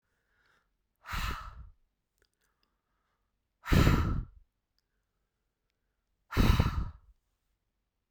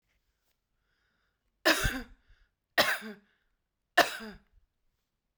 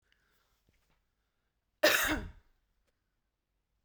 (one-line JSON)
{"exhalation_length": "8.1 s", "exhalation_amplitude": 9953, "exhalation_signal_mean_std_ratio": 0.3, "three_cough_length": "5.4 s", "three_cough_amplitude": 19241, "three_cough_signal_mean_std_ratio": 0.27, "cough_length": "3.8 s", "cough_amplitude": 8276, "cough_signal_mean_std_ratio": 0.25, "survey_phase": "beta (2021-08-13 to 2022-03-07)", "age": "45-64", "gender": "Female", "wearing_mask": "No", "symptom_none": true, "smoker_status": "Ex-smoker", "respiratory_condition_asthma": false, "respiratory_condition_other": false, "recruitment_source": "REACT", "submission_delay": "5 days", "covid_test_result": "Negative", "covid_test_method": "RT-qPCR"}